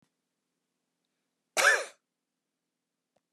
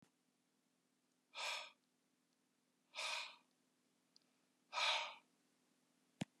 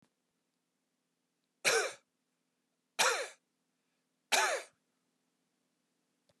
{"cough_length": "3.3 s", "cough_amplitude": 10465, "cough_signal_mean_std_ratio": 0.22, "exhalation_length": "6.4 s", "exhalation_amplitude": 1673, "exhalation_signal_mean_std_ratio": 0.32, "three_cough_length": "6.4 s", "three_cough_amplitude": 8205, "three_cough_signal_mean_std_ratio": 0.28, "survey_phase": "beta (2021-08-13 to 2022-03-07)", "age": "65+", "gender": "Male", "wearing_mask": "No", "symptom_none": true, "smoker_status": "Never smoked", "respiratory_condition_asthma": false, "respiratory_condition_other": false, "recruitment_source": "REACT", "submission_delay": "6 days", "covid_test_result": "Negative", "covid_test_method": "RT-qPCR"}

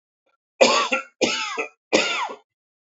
{"three_cough_length": "3.0 s", "three_cough_amplitude": 27211, "three_cough_signal_mean_std_ratio": 0.47, "survey_phase": "beta (2021-08-13 to 2022-03-07)", "age": "18-44", "gender": "Male", "wearing_mask": "No", "symptom_cough_any": true, "symptom_fever_high_temperature": true, "symptom_headache": true, "symptom_change_to_sense_of_smell_or_taste": true, "symptom_onset": "2 days", "smoker_status": "Never smoked", "respiratory_condition_asthma": false, "respiratory_condition_other": false, "recruitment_source": "Test and Trace", "submission_delay": "1 day", "covid_test_result": "Positive", "covid_test_method": "RT-qPCR"}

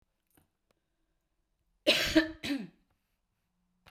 {"cough_length": "3.9 s", "cough_amplitude": 8668, "cough_signal_mean_std_ratio": 0.28, "survey_phase": "beta (2021-08-13 to 2022-03-07)", "age": "65+", "gender": "Female", "wearing_mask": "No", "symptom_none": true, "smoker_status": "Never smoked", "respiratory_condition_asthma": false, "respiratory_condition_other": false, "recruitment_source": "REACT", "submission_delay": "1 day", "covid_test_result": "Negative", "covid_test_method": "RT-qPCR", "influenza_a_test_result": "Negative", "influenza_b_test_result": "Negative"}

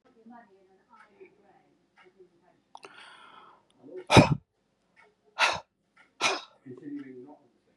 {"exhalation_length": "7.8 s", "exhalation_amplitude": 26719, "exhalation_signal_mean_std_ratio": 0.22, "survey_phase": "beta (2021-08-13 to 2022-03-07)", "age": "45-64", "gender": "Female", "wearing_mask": "No", "symptom_headache": true, "smoker_status": "Current smoker (11 or more cigarettes per day)", "respiratory_condition_asthma": false, "respiratory_condition_other": false, "recruitment_source": "REACT", "submission_delay": "2 days", "covid_test_result": "Negative", "covid_test_method": "RT-qPCR", "influenza_a_test_result": "Unknown/Void", "influenza_b_test_result": "Unknown/Void"}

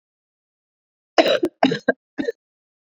{"cough_length": "3.0 s", "cough_amplitude": 30121, "cough_signal_mean_std_ratio": 0.31, "survey_phase": "beta (2021-08-13 to 2022-03-07)", "age": "18-44", "gender": "Female", "wearing_mask": "No", "symptom_runny_or_blocked_nose": true, "symptom_onset": "8 days", "smoker_status": "Never smoked", "respiratory_condition_asthma": true, "respiratory_condition_other": false, "recruitment_source": "REACT", "submission_delay": "1 day", "covid_test_result": "Negative", "covid_test_method": "RT-qPCR"}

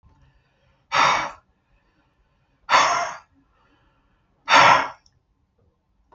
{"exhalation_length": "6.1 s", "exhalation_amplitude": 32213, "exhalation_signal_mean_std_ratio": 0.33, "survey_phase": "beta (2021-08-13 to 2022-03-07)", "age": "45-64", "gender": "Male", "wearing_mask": "No", "symptom_none": true, "smoker_status": "Never smoked", "respiratory_condition_asthma": false, "respiratory_condition_other": false, "recruitment_source": "REACT", "submission_delay": "4 days", "covid_test_result": "Negative", "covid_test_method": "RT-qPCR"}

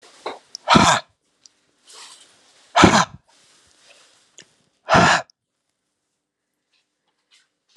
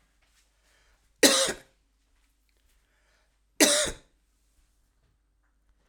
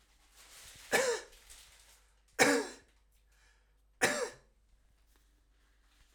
{"exhalation_length": "7.8 s", "exhalation_amplitude": 32767, "exhalation_signal_mean_std_ratio": 0.28, "cough_length": "5.9 s", "cough_amplitude": 28685, "cough_signal_mean_std_ratio": 0.24, "three_cough_length": "6.1 s", "three_cough_amplitude": 10135, "three_cough_signal_mean_std_ratio": 0.31, "survey_phase": "alpha (2021-03-01 to 2021-08-12)", "age": "65+", "gender": "Male", "wearing_mask": "No", "symptom_cough_any": true, "symptom_fever_high_temperature": true, "symptom_headache": true, "smoker_status": "Ex-smoker", "respiratory_condition_asthma": false, "respiratory_condition_other": false, "recruitment_source": "Test and Trace", "submission_delay": "2 days", "covid_test_result": "Positive", "covid_test_method": "RT-qPCR", "covid_ct_value": 27.7, "covid_ct_gene": "ORF1ab gene", "covid_ct_mean": 28.5, "covid_viral_load": "440 copies/ml", "covid_viral_load_category": "Minimal viral load (< 10K copies/ml)"}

